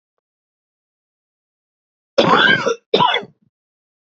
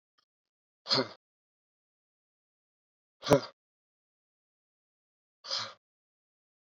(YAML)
cough_length: 4.2 s
cough_amplitude: 29324
cough_signal_mean_std_ratio: 0.35
exhalation_length: 6.7 s
exhalation_amplitude: 12150
exhalation_signal_mean_std_ratio: 0.18
survey_phase: beta (2021-08-13 to 2022-03-07)
age: 18-44
gender: Male
wearing_mask: 'No'
symptom_runny_or_blocked_nose: true
symptom_onset: 2 days
smoker_status: Current smoker (1 to 10 cigarettes per day)
respiratory_condition_asthma: false
respiratory_condition_other: false
recruitment_source: Test and Trace
submission_delay: 1 day
covid_test_result: Positive
covid_test_method: RT-qPCR
covid_ct_value: 18.5
covid_ct_gene: ORF1ab gene
covid_ct_mean: 19.1
covid_viral_load: 540000 copies/ml
covid_viral_load_category: Low viral load (10K-1M copies/ml)